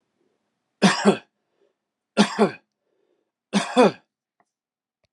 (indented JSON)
{
  "three_cough_length": "5.1 s",
  "three_cough_amplitude": 24906,
  "three_cough_signal_mean_std_ratio": 0.3,
  "survey_phase": "beta (2021-08-13 to 2022-03-07)",
  "age": "45-64",
  "gender": "Male",
  "wearing_mask": "No",
  "symptom_abdominal_pain": true,
  "symptom_fatigue": true,
  "symptom_fever_high_temperature": true,
  "symptom_onset": "12 days",
  "smoker_status": "Never smoked",
  "respiratory_condition_asthma": false,
  "respiratory_condition_other": false,
  "recruitment_source": "REACT",
  "submission_delay": "1 day",
  "covid_test_result": "Negative",
  "covid_test_method": "RT-qPCR"
}